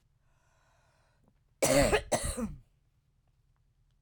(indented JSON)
{
  "cough_length": "4.0 s",
  "cough_amplitude": 8121,
  "cough_signal_mean_std_ratio": 0.34,
  "survey_phase": "beta (2021-08-13 to 2022-03-07)",
  "age": "45-64",
  "gender": "Female",
  "wearing_mask": "No",
  "symptom_cough_any": true,
  "symptom_runny_or_blocked_nose": true,
  "symptom_sore_throat": true,
  "symptom_fatigue": true,
  "symptom_headache": true,
  "symptom_other": true,
  "symptom_onset": "2 days",
  "smoker_status": "Current smoker (11 or more cigarettes per day)",
  "respiratory_condition_asthma": false,
  "respiratory_condition_other": false,
  "recruitment_source": "Test and Trace",
  "submission_delay": "1 day",
  "covid_test_result": "Negative",
  "covid_test_method": "RT-qPCR"
}